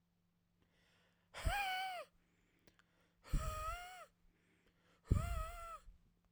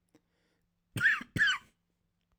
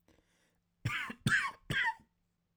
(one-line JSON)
{"exhalation_length": "6.3 s", "exhalation_amplitude": 3910, "exhalation_signal_mean_std_ratio": 0.42, "cough_length": "2.4 s", "cough_amplitude": 5039, "cough_signal_mean_std_ratio": 0.36, "three_cough_length": "2.6 s", "three_cough_amplitude": 3799, "three_cough_signal_mean_std_ratio": 0.44, "survey_phase": "alpha (2021-03-01 to 2021-08-12)", "age": "18-44", "gender": "Male", "wearing_mask": "No", "symptom_cough_any": true, "symptom_onset": "5 days", "smoker_status": "Never smoked", "respiratory_condition_asthma": false, "respiratory_condition_other": false, "recruitment_source": "REACT", "submission_delay": "2 days", "covid_test_result": "Negative", "covid_test_method": "RT-qPCR"}